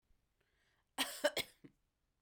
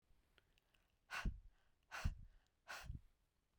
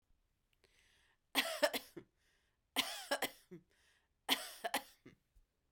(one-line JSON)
{"cough_length": "2.2 s", "cough_amplitude": 3270, "cough_signal_mean_std_ratio": 0.28, "exhalation_length": "3.6 s", "exhalation_amplitude": 1187, "exhalation_signal_mean_std_ratio": 0.36, "three_cough_length": "5.7 s", "three_cough_amplitude": 5058, "three_cough_signal_mean_std_ratio": 0.32, "survey_phase": "beta (2021-08-13 to 2022-03-07)", "age": "45-64", "gender": "Female", "wearing_mask": "No", "symptom_none": true, "symptom_onset": "9 days", "smoker_status": "Never smoked", "respiratory_condition_asthma": false, "respiratory_condition_other": false, "recruitment_source": "REACT", "submission_delay": "2 days", "covid_test_result": "Negative", "covid_test_method": "RT-qPCR", "influenza_a_test_result": "Unknown/Void", "influenza_b_test_result": "Unknown/Void"}